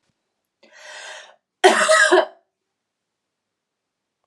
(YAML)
cough_length: 4.3 s
cough_amplitude: 32695
cough_signal_mean_std_ratio: 0.31
survey_phase: beta (2021-08-13 to 2022-03-07)
age: 18-44
gender: Female
wearing_mask: 'No'
symptom_cough_any: true
symptom_runny_or_blocked_nose: true
symptom_sore_throat: true
symptom_fatigue: true
symptom_change_to_sense_of_smell_or_taste: true
symptom_loss_of_taste: true
symptom_onset: 5 days
smoker_status: Never smoked
respiratory_condition_asthma: false
respiratory_condition_other: false
recruitment_source: Test and Trace
submission_delay: 2 days
covid_test_result: Positive
covid_test_method: RT-qPCR
covid_ct_value: 16.0
covid_ct_gene: ORF1ab gene